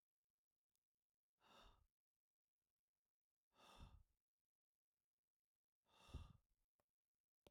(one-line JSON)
{"exhalation_length": "7.5 s", "exhalation_amplitude": 218, "exhalation_signal_mean_std_ratio": 0.25, "survey_phase": "alpha (2021-03-01 to 2021-08-12)", "age": "45-64", "gender": "Male", "wearing_mask": "No", "symptom_none": true, "smoker_status": "Never smoked", "respiratory_condition_asthma": false, "respiratory_condition_other": false, "recruitment_source": "REACT", "submission_delay": "2 days", "covid_test_result": "Negative", "covid_test_method": "RT-qPCR"}